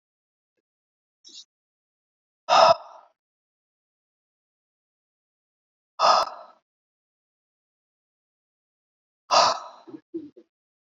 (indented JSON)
{
  "exhalation_length": "10.9 s",
  "exhalation_amplitude": 23134,
  "exhalation_signal_mean_std_ratio": 0.22,
  "survey_phase": "alpha (2021-03-01 to 2021-08-12)",
  "age": "18-44",
  "gender": "Male",
  "wearing_mask": "No",
  "symptom_cough_any": true,
  "symptom_fatigue": true,
  "symptom_headache": true,
  "symptom_onset": "3 days",
  "smoker_status": "Ex-smoker",
  "respiratory_condition_asthma": false,
  "respiratory_condition_other": false,
  "recruitment_source": "Test and Trace",
  "submission_delay": "1 day",
  "covid_test_result": "Positive",
  "covid_test_method": "RT-qPCR"
}